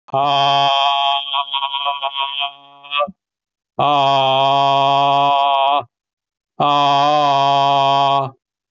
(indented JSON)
{
  "exhalation_length": "8.7 s",
  "exhalation_amplitude": 23485,
  "exhalation_signal_mean_std_ratio": 0.81,
  "survey_phase": "beta (2021-08-13 to 2022-03-07)",
  "age": "45-64",
  "gender": "Male",
  "wearing_mask": "No",
  "symptom_none": true,
  "smoker_status": "Ex-smoker",
  "respiratory_condition_asthma": false,
  "respiratory_condition_other": false,
  "recruitment_source": "REACT",
  "submission_delay": "4 days",
  "covid_test_result": "Negative",
  "covid_test_method": "RT-qPCR"
}